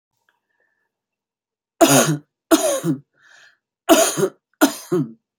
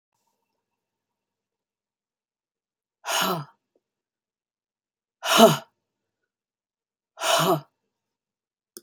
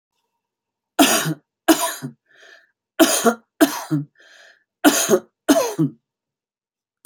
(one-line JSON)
{"cough_length": "5.4 s", "cough_amplitude": 32767, "cough_signal_mean_std_ratio": 0.39, "exhalation_length": "8.8 s", "exhalation_amplitude": 27828, "exhalation_signal_mean_std_ratio": 0.24, "three_cough_length": "7.1 s", "three_cough_amplitude": 32678, "three_cough_signal_mean_std_ratio": 0.39, "survey_phase": "beta (2021-08-13 to 2022-03-07)", "age": "65+", "gender": "Female", "wearing_mask": "No", "symptom_cough_any": true, "smoker_status": "Ex-smoker", "respiratory_condition_asthma": true, "respiratory_condition_other": false, "recruitment_source": "REACT", "submission_delay": "2 days", "covid_test_result": "Negative", "covid_test_method": "RT-qPCR"}